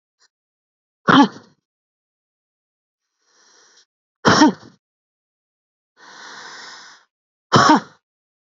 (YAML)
exhalation_length: 8.4 s
exhalation_amplitude: 31966
exhalation_signal_mean_std_ratio: 0.26
survey_phase: beta (2021-08-13 to 2022-03-07)
age: 18-44
gender: Female
wearing_mask: 'No'
symptom_runny_or_blocked_nose: true
symptom_sore_throat: true
symptom_onset: 13 days
smoker_status: Never smoked
respiratory_condition_asthma: true
respiratory_condition_other: false
recruitment_source: REACT
submission_delay: 1 day
covid_test_result: Negative
covid_test_method: RT-qPCR
influenza_a_test_result: Negative
influenza_b_test_result: Negative